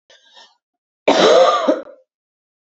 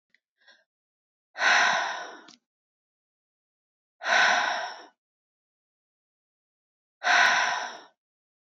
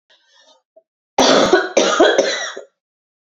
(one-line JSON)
{"cough_length": "2.7 s", "cough_amplitude": 30617, "cough_signal_mean_std_ratio": 0.43, "exhalation_length": "8.4 s", "exhalation_amplitude": 14234, "exhalation_signal_mean_std_ratio": 0.38, "three_cough_length": "3.2 s", "three_cough_amplitude": 32768, "three_cough_signal_mean_std_ratio": 0.5, "survey_phase": "beta (2021-08-13 to 2022-03-07)", "age": "18-44", "gender": "Female", "wearing_mask": "No", "symptom_runny_or_blocked_nose": true, "smoker_status": "Ex-smoker", "respiratory_condition_asthma": false, "respiratory_condition_other": false, "recruitment_source": "REACT", "submission_delay": "2 days", "covid_test_result": "Negative", "covid_test_method": "RT-qPCR"}